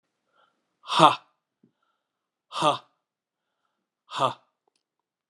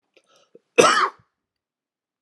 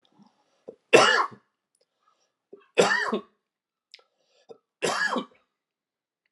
{"exhalation_length": "5.3 s", "exhalation_amplitude": 29899, "exhalation_signal_mean_std_ratio": 0.23, "cough_length": "2.2 s", "cough_amplitude": 32613, "cough_signal_mean_std_ratio": 0.28, "three_cough_length": "6.3 s", "three_cough_amplitude": 27316, "three_cough_signal_mean_std_ratio": 0.3, "survey_phase": "alpha (2021-03-01 to 2021-08-12)", "age": "45-64", "gender": "Male", "wearing_mask": "No", "symptom_cough_any": true, "symptom_shortness_of_breath": true, "symptom_fatigue": true, "symptom_change_to_sense_of_smell_or_taste": true, "symptom_onset": "4 days", "smoker_status": "Never smoked", "respiratory_condition_asthma": false, "respiratory_condition_other": false, "recruitment_source": "Test and Trace", "submission_delay": "2 days", "covid_test_result": "Positive", "covid_test_method": "RT-qPCR"}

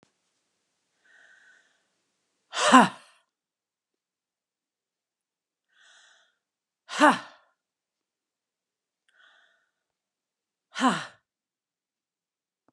{"exhalation_length": "12.7 s", "exhalation_amplitude": 29427, "exhalation_signal_mean_std_ratio": 0.17, "survey_phase": "beta (2021-08-13 to 2022-03-07)", "age": "45-64", "gender": "Female", "wearing_mask": "No", "symptom_none": true, "smoker_status": "Never smoked", "respiratory_condition_asthma": true, "respiratory_condition_other": false, "recruitment_source": "REACT", "submission_delay": "1 day", "covid_test_result": "Negative", "covid_test_method": "RT-qPCR", "influenza_a_test_result": "Unknown/Void", "influenza_b_test_result": "Unknown/Void"}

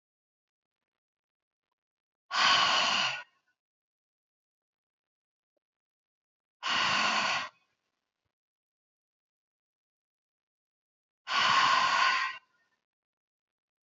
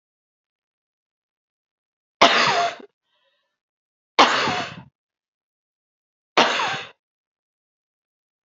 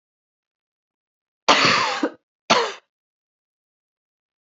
{"exhalation_length": "13.8 s", "exhalation_amplitude": 7991, "exhalation_signal_mean_std_ratio": 0.36, "three_cough_length": "8.4 s", "three_cough_amplitude": 29415, "three_cough_signal_mean_std_ratio": 0.29, "cough_length": "4.4 s", "cough_amplitude": 28536, "cough_signal_mean_std_ratio": 0.32, "survey_phase": "beta (2021-08-13 to 2022-03-07)", "age": "45-64", "gender": "Female", "wearing_mask": "No", "symptom_cough_any": true, "symptom_runny_or_blocked_nose": true, "symptom_fatigue": true, "symptom_fever_high_temperature": true, "symptom_headache": true, "symptom_other": true, "smoker_status": "Prefer not to say", "respiratory_condition_asthma": false, "respiratory_condition_other": false, "recruitment_source": "Test and Trace", "submission_delay": "1 day", "covid_test_result": "Positive", "covid_test_method": "LFT"}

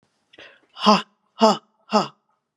{"exhalation_length": "2.6 s", "exhalation_amplitude": 30705, "exhalation_signal_mean_std_ratio": 0.31, "survey_phase": "beta (2021-08-13 to 2022-03-07)", "age": "45-64", "gender": "Female", "wearing_mask": "No", "symptom_runny_or_blocked_nose": true, "symptom_sore_throat": true, "symptom_headache": true, "symptom_onset": "3 days", "smoker_status": "Current smoker (1 to 10 cigarettes per day)", "respiratory_condition_asthma": false, "respiratory_condition_other": false, "recruitment_source": "Test and Trace", "submission_delay": "2 days", "covid_test_result": "Positive", "covid_test_method": "RT-qPCR", "covid_ct_value": 16.8, "covid_ct_gene": "ORF1ab gene", "covid_ct_mean": 17.1, "covid_viral_load": "2400000 copies/ml", "covid_viral_load_category": "High viral load (>1M copies/ml)"}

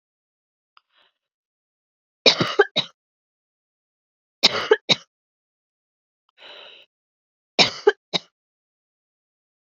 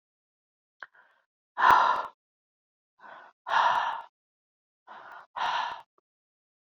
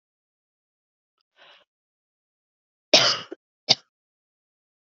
{"three_cough_length": "9.6 s", "three_cough_amplitude": 32768, "three_cough_signal_mean_std_ratio": 0.21, "exhalation_length": "6.7 s", "exhalation_amplitude": 14640, "exhalation_signal_mean_std_ratio": 0.34, "cough_length": "4.9 s", "cough_amplitude": 31892, "cough_signal_mean_std_ratio": 0.18, "survey_phase": "beta (2021-08-13 to 2022-03-07)", "age": "18-44", "gender": "Female", "wearing_mask": "No", "symptom_cough_any": true, "symptom_runny_or_blocked_nose": true, "symptom_fatigue": true, "symptom_fever_high_temperature": true, "symptom_headache": true, "smoker_status": "Never smoked", "respiratory_condition_asthma": false, "respiratory_condition_other": false, "recruitment_source": "Test and Trace", "submission_delay": "2 days", "covid_test_result": "Positive", "covid_test_method": "RT-qPCR"}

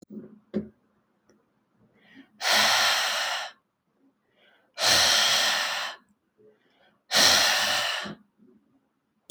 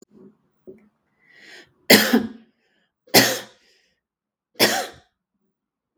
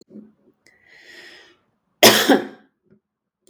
{"exhalation_length": "9.3 s", "exhalation_amplitude": 17434, "exhalation_signal_mean_std_ratio": 0.5, "three_cough_length": "6.0 s", "three_cough_amplitude": 32768, "three_cough_signal_mean_std_ratio": 0.27, "cough_length": "3.5 s", "cough_amplitude": 32768, "cough_signal_mean_std_ratio": 0.26, "survey_phase": "beta (2021-08-13 to 2022-03-07)", "age": "18-44", "gender": "Female", "wearing_mask": "No", "symptom_none": true, "smoker_status": "Never smoked", "respiratory_condition_asthma": false, "respiratory_condition_other": false, "recruitment_source": "REACT", "submission_delay": "2 days", "covid_test_result": "Negative", "covid_test_method": "RT-qPCR"}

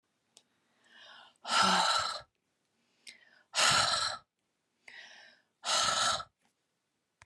{"exhalation_length": "7.3 s", "exhalation_amplitude": 7165, "exhalation_signal_mean_std_ratio": 0.43, "survey_phase": "beta (2021-08-13 to 2022-03-07)", "age": "45-64", "gender": "Female", "wearing_mask": "No", "symptom_none": true, "smoker_status": "Never smoked", "respiratory_condition_asthma": false, "respiratory_condition_other": false, "recruitment_source": "REACT", "submission_delay": "2 days", "covid_test_result": "Negative", "covid_test_method": "RT-qPCR"}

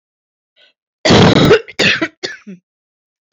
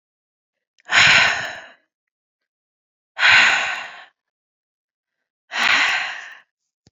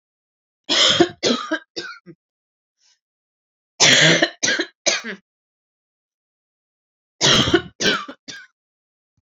{"cough_length": "3.3 s", "cough_amplitude": 30286, "cough_signal_mean_std_ratio": 0.43, "exhalation_length": "6.9 s", "exhalation_amplitude": 29202, "exhalation_signal_mean_std_ratio": 0.4, "three_cough_length": "9.2 s", "three_cough_amplitude": 31463, "three_cough_signal_mean_std_ratio": 0.38, "survey_phase": "alpha (2021-03-01 to 2021-08-12)", "age": "18-44", "gender": "Female", "wearing_mask": "No", "symptom_none": true, "smoker_status": "Current smoker (1 to 10 cigarettes per day)", "respiratory_condition_asthma": false, "respiratory_condition_other": false, "recruitment_source": "REACT", "submission_delay": "5 days", "covid_test_result": "Negative", "covid_test_method": "RT-qPCR"}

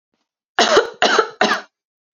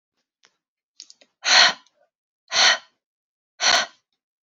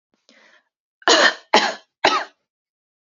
{"cough_length": "2.1 s", "cough_amplitude": 30791, "cough_signal_mean_std_ratio": 0.46, "exhalation_length": "4.5 s", "exhalation_amplitude": 29138, "exhalation_signal_mean_std_ratio": 0.32, "three_cough_length": "3.1 s", "three_cough_amplitude": 32768, "three_cough_signal_mean_std_ratio": 0.35, "survey_phase": "alpha (2021-03-01 to 2021-08-12)", "age": "18-44", "gender": "Female", "wearing_mask": "No", "symptom_fatigue": true, "smoker_status": "Never smoked", "respiratory_condition_asthma": false, "respiratory_condition_other": false, "recruitment_source": "Test and Trace", "submission_delay": "1 day", "covid_test_result": "Positive", "covid_test_method": "RT-qPCR"}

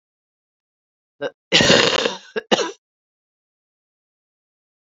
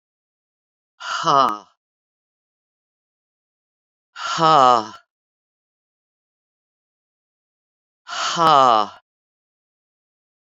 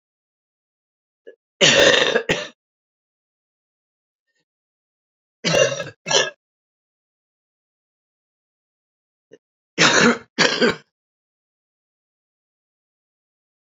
{"cough_length": "4.9 s", "cough_amplitude": 31358, "cough_signal_mean_std_ratio": 0.31, "exhalation_length": "10.5 s", "exhalation_amplitude": 27808, "exhalation_signal_mean_std_ratio": 0.28, "three_cough_length": "13.7 s", "three_cough_amplitude": 31504, "three_cough_signal_mean_std_ratio": 0.29, "survey_phase": "beta (2021-08-13 to 2022-03-07)", "age": "65+", "gender": "Female", "wearing_mask": "No", "symptom_cough_any": true, "symptom_runny_or_blocked_nose": true, "symptom_sore_throat": true, "symptom_abdominal_pain": true, "symptom_fatigue": true, "symptom_fever_high_temperature": true, "symptom_headache": true, "symptom_onset": "3 days", "smoker_status": "Ex-smoker", "respiratory_condition_asthma": false, "respiratory_condition_other": false, "recruitment_source": "Test and Trace", "submission_delay": "1 day", "covid_test_result": "Positive", "covid_test_method": "RT-qPCR", "covid_ct_value": 18.7, "covid_ct_gene": "ORF1ab gene"}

